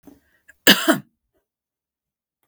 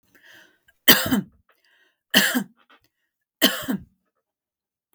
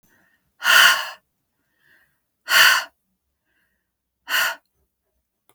cough_length: 2.5 s
cough_amplitude: 32768
cough_signal_mean_std_ratio: 0.23
three_cough_length: 4.9 s
three_cough_amplitude: 32768
three_cough_signal_mean_std_ratio: 0.3
exhalation_length: 5.5 s
exhalation_amplitude: 32766
exhalation_signal_mean_std_ratio: 0.32
survey_phase: beta (2021-08-13 to 2022-03-07)
age: 45-64
gender: Female
wearing_mask: 'No'
symptom_fatigue: true
symptom_change_to_sense_of_smell_or_taste: true
symptom_onset: 12 days
smoker_status: Ex-smoker
respiratory_condition_asthma: false
respiratory_condition_other: false
recruitment_source: REACT
submission_delay: 2 days
covid_test_result: Negative
covid_test_method: RT-qPCR
influenza_a_test_result: Negative
influenza_b_test_result: Negative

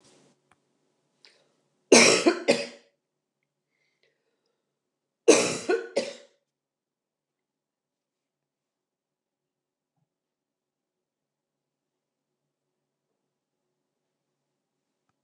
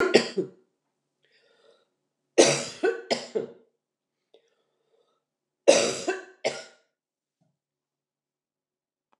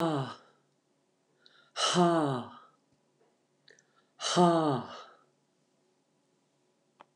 cough_length: 15.2 s
cough_amplitude: 29043
cough_signal_mean_std_ratio: 0.19
three_cough_length: 9.2 s
three_cough_amplitude: 25039
three_cough_signal_mean_std_ratio: 0.28
exhalation_length: 7.2 s
exhalation_amplitude: 7760
exhalation_signal_mean_std_ratio: 0.37
survey_phase: beta (2021-08-13 to 2022-03-07)
age: 65+
gender: Female
wearing_mask: 'No'
symptom_prefer_not_to_say: true
symptom_onset: 12 days
smoker_status: Ex-smoker
respiratory_condition_asthma: false
respiratory_condition_other: false
recruitment_source: REACT
submission_delay: 1 day
covid_test_result: Negative
covid_test_method: RT-qPCR
influenza_a_test_result: Negative
influenza_b_test_result: Negative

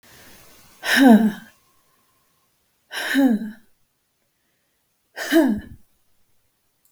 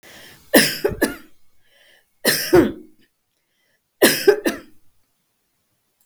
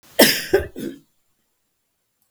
exhalation_length: 6.9 s
exhalation_amplitude: 27211
exhalation_signal_mean_std_ratio: 0.35
three_cough_length: 6.1 s
three_cough_amplitude: 32768
three_cough_signal_mean_std_ratio: 0.34
cough_length: 2.3 s
cough_amplitude: 32768
cough_signal_mean_std_ratio: 0.31
survey_phase: beta (2021-08-13 to 2022-03-07)
age: 65+
gender: Female
wearing_mask: 'No'
symptom_sore_throat: true
symptom_onset: 3 days
smoker_status: Ex-smoker
respiratory_condition_asthma: false
respiratory_condition_other: false
recruitment_source: REACT
submission_delay: 1 day
covid_test_result: Negative
covid_test_method: RT-qPCR
influenza_a_test_result: Negative
influenza_b_test_result: Negative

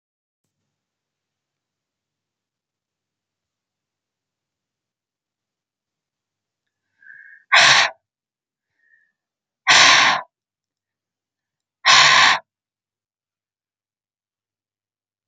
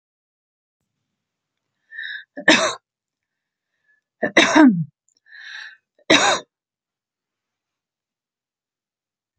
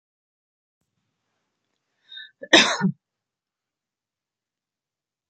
exhalation_length: 15.3 s
exhalation_amplitude: 31688
exhalation_signal_mean_std_ratio: 0.24
three_cough_length: 9.4 s
three_cough_amplitude: 31523
three_cough_signal_mean_std_ratio: 0.27
cough_length: 5.3 s
cough_amplitude: 29303
cough_signal_mean_std_ratio: 0.19
survey_phase: beta (2021-08-13 to 2022-03-07)
age: 45-64
gender: Female
wearing_mask: 'No'
symptom_none: true
symptom_onset: 13 days
smoker_status: Never smoked
respiratory_condition_asthma: false
respiratory_condition_other: false
recruitment_source: REACT
submission_delay: 4 days
covid_test_result: Negative
covid_test_method: RT-qPCR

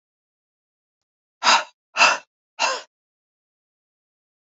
exhalation_length: 4.4 s
exhalation_amplitude: 27050
exhalation_signal_mean_std_ratio: 0.27
survey_phase: beta (2021-08-13 to 2022-03-07)
age: 45-64
gender: Female
wearing_mask: 'No'
symptom_cough_any: true
symptom_runny_or_blocked_nose: true
symptom_sore_throat: true
symptom_fatigue: true
symptom_headache: true
symptom_change_to_sense_of_smell_or_taste: true
symptom_onset: 3 days
smoker_status: Never smoked
respiratory_condition_asthma: false
respiratory_condition_other: false
recruitment_source: Test and Trace
submission_delay: 2 days
covid_test_result: Positive
covid_test_method: RT-qPCR
covid_ct_value: 20.5
covid_ct_gene: ORF1ab gene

